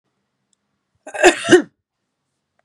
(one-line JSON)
{"cough_length": "2.6 s", "cough_amplitude": 32768, "cough_signal_mean_std_ratio": 0.26, "survey_phase": "beta (2021-08-13 to 2022-03-07)", "age": "45-64", "gender": "Female", "wearing_mask": "No", "symptom_runny_or_blocked_nose": true, "symptom_sore_throat": true, "symptom_fatigue": true, "symptom_headache": true, "symptom_onset": "3 days", "smoker_status": "Never smoked", "respiratory_condition_asthma": false, "respiratory_condition_other": false, "recruitment_source": "Test and Trace", "submission_delay": "2 days", "covid_test_result": "Positive", "covid_test_method": "RT-qPCR", "covid_ct_value": 19.0, "covid_ct_gene": "N gene", "covid_ct_mean": 19.5, "covid_viral_load": "410000 copies/ml", "covid_viral_load_category": "Low viral load (10K-1M copies/ml)"}